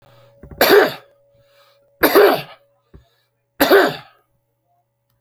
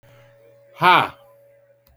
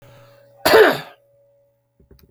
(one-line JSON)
{"three_cough_length": "5.2 s", "three_cough_amplitude": 32767, "three_cough_signal_mean_std_ratio": 0.36, "exhalation_length": "2.0 s", "exhalation_amplitude": 26526, "exhalation_signal_mean_std_ratio": 0.3, "cough_length": "2.3 s", "cough_amplitude": 29460, "cough_signal_mean_std_ratio": 0.31, "survey_phase": "beta (2021-08-13 to 2022-03-07)", "age": "65+", "gender": "Male", "wearing_mask": "No", "symptom_none": true, "smoker_status": "Ex-smoker", "respiratory_condition_asthma": true, "respiratory_condition_other": false, "recruitment_source": "REACT", "submission_delay": "1 day", "covid_test_result": "Negative", "covid_test_method": "RT-qPCR"}